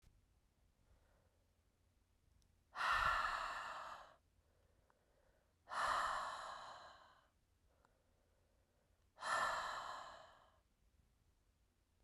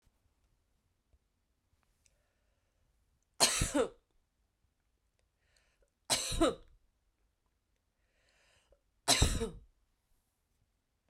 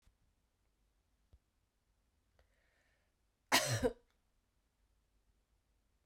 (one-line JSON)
{"exhalation_length": "12.0 s", "exhalation_amplitude": 1721, "exhalation_signal_mean_std_ratio": 0.42, "three_cough_length": "11.1 s", "three_cough_amplitude": 10022, "three_cough_signal_mean_std_ratio": 0.26, "cough_length": "6.1 s", "cough_amplitude": 6413, "cough_signal_mean_std_ratio": 0.2, "survey_phase": "beta (2021-08-13 to 2022-03-07)", "age": "18-44", "gender": "Female", "wearing_mask": "No", "symptom_runny_or_blocked_nose": true, "symptom_sore_throat": true, "symptom_fatigue": true, "symptom_headache": true, "smoker_status": "Never smoked", "respiratory_condition_asthma": false, "respiratory_condition_other": false, "recruitment_source": "Test and Trace", "submission_delay": "2 days", "covid_test_result": "Positive", "covid_test_method": "RT-qPCR", "covid_ct_value": 21.8, "covid_ct_gene": "S gene", "covid_ct_mean": 22.3, "covid_viral_load": "50000 copies/ml", "covid_viral_load_category": "Low viral load (10K-1M copies/ml)"}